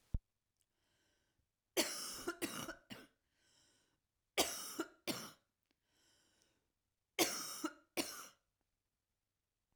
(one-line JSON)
{"three_cough_length": "9.8 s", "three_cough_amplitude": 3507, "three_cough_signal_mean_std_ratio": 0.33, "survey_phase": "alpha (2021-03-01 to 2021-08-12)", "age": "45-64", "gender": "Female", "wearing_mask": "No", "symptom_cough_any": true, "symptom_fatigue": true, "symptom_fever_high_temperature": true, "symptom_headache": true, "symptom_onset": "3 days", "smoker_status": "Never smoked", "respiratory_condition_asthma": false, "respiratory_condition_other": false, "recruitment_source": "Test and Trace", "submission_delay": "2 days", "covid_test_result": "Positive", "covid_test_method": "RT-qPCR", "covid_ct_value": 17.2, "covid_ct_gene": "ORF1ab gene", "covid_ct_mean": 18.6, "covid_viral_load": "800000 copies/ml", "covid_viral_load_category": "Low viral load (10K-1M copies/ml)"}